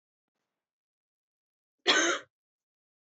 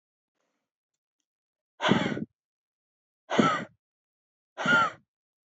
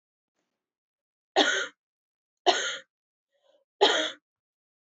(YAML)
cough_length: 3.2 s
cough_amplitude: 10680
cough_signal_mean_std_ratio: 0.25
exhalation_length: 5.5 s
exhalation_amplitude: 15307
exhalation_signal_mean_std_ratio: 0.33
three_cough_length: 4.9 s
three_cough_amplitude: 16803
three_cough_signal_mean_std_ratio: 0.3
survey_phase: alpha (2021-03-01 to 2021-08-12)
age: 18-44
gender: Female
wearing_mask: 'No'
symptom_none: true
smoker_status: Never smoked
respiratory_condition_asthma: false
respiratory_condition_other: false
recruitment_source: REACT
submission_delay: 2 days
covid_test_result: Negative
covid_test_method: RT-qPCR